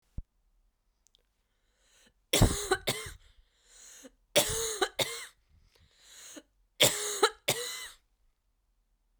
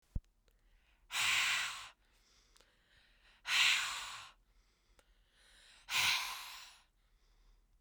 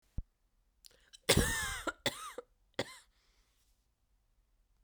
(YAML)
three_cough_length: 9.2 s
three_cough_amplitude: 11929
three_cough_signal_mean_std_ratio: 0.33
exhalation_length: 7.8 s
exhalation_amplitude: 4047
exhalation_signal_mean_std_ratio: 0.41
cough_length: 4.8 s
cough_amplitude: 10424
cough_signal_mean_std_ratio: 0.3
survey_phase: beta (2021-08-13 to 2022-03-07)
age: 18-44
gender: Female
wearing_mask: 'No'
symptom_runny_or_blocked_nose: true
symptom_fatigue: true
symptom_headache: true
symptom_change_to_sense_of_smell_or_taste: true
symptom_loss_of_taste: true
symptom_other: true
smoker_status: Ex-smoker
respiratory_condition_asthma: true
respiratory_condition_other: false
recruitment_source: Test and Trace
submission_delay: 1 day
covid_test_result: Positive
covid_test_method: RT-qPCR
covid_ct_value: 17.5
covid_ct_gene: ORF1ab gene
covid_ct_mean: 18.4
covid_viral_load: 900000 copies/ml
covid_viral_load_category: Low viral load (10K-1M copies/ml)